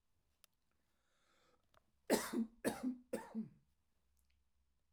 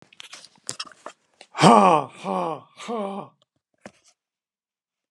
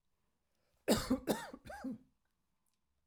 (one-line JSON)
{"three_cough_length": "4.9 s", "three_cough_amplitude": 3379, "three_cough_signal_mean_std_ratio": 0.32, "exhalation_length": "5.1 s", "exhalation_amplitude": 31223, "exhalation_signal_mean_std_ratio": 0.3, "cough_length": "3.1 s", "cough_amplitude": 4913, "cough_signal_mean_std_ratio": 0.34, "survey_phase": "alpha (2021-03-01 to 2021-08-12)", "age": "65+", "gender": "Male", "wearing_mask": "No", "symptom_none": true, "smoker_status": "Never smoked", "respiratory_condition_asthma": false, "respiratory_condition_other": false, "recruitment_source": "REACT", "submission_delay": "1 day", "covid_test_result": "Negative", "covid_test_method": "RT-qPCR"}